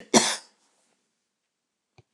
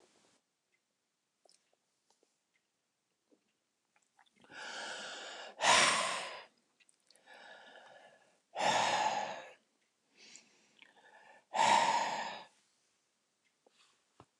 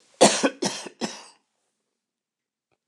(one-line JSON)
{"cough_length": "2.1 s", "cough_amplitude": 22222, "cough_signal_mean_std_ratio": 0.23, "exhalation_length": "14.4 s", "exhalation_amplitude": 6660, "exhalation_signal_mean_std_ratio": 0.35, "three_cough_length": "2.9 s", "three_cough_amplitude": 27229, "three_cough_signal_mean_std_ratio": 0.28, "survey_phase": "beta (2021-08-13 to 2022-03-07)", "age": "65+", "gender": "Female", "wearing_mask": "No", "symptom_none": true, "smoker_status": "Ex-smoker", "respiratory_condition_asthma": false, "respiratory_condition_other": true, "recruitment_source": "REACT", "submission_delay": "1 day", "covid_test_result": "Negative", "covid_test_method": "RT-qPCR"}